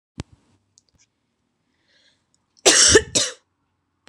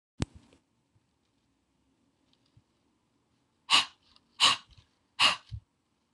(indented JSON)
{
  "cough_length": "4.1 s",
  "cough_amplitude": 26028,
  "cough_signal_mean_std_ratio": 0.27,
  "exhalation_length": "6.1 s",
  "exhalation_amplitude": 12058,
  "exhalation_signal_mean_std_ratio": 0.23,
  "survey_phase": "beta (2021-08-13 to 2022-03-07)",
  "age": "18-44",
  "gender": "Female",
  "wearing_mask": "No",
  "symptom_shortness_of_breath": true,
  "symptom_sore_throat": true,
  "symptom_headache": true,
  "symptom_change_to_sense_of_smell_or_taste": true,
  "symptom_onset": "2 days",
  "smoker_status": "Never smoked",
  "respiratory_condition_asthma": false,
  "respiratory_condition_other": false,
  "recruitment_source": "Test and Trace",
  "submission_delay": "2 days",
  "covid_test_result": "Positive",
  "covid_test_method": "RT-qPCR",
  "covid_ct_value": 18.6,
  "covid_ct_gene": "N gene",
  "covid_ct_mean": 19.8,
  "covid_viral_load": "320000 copies/ml",
  "covid_viral_load_category": "Low viral load (10K-1M copies/ml)"
}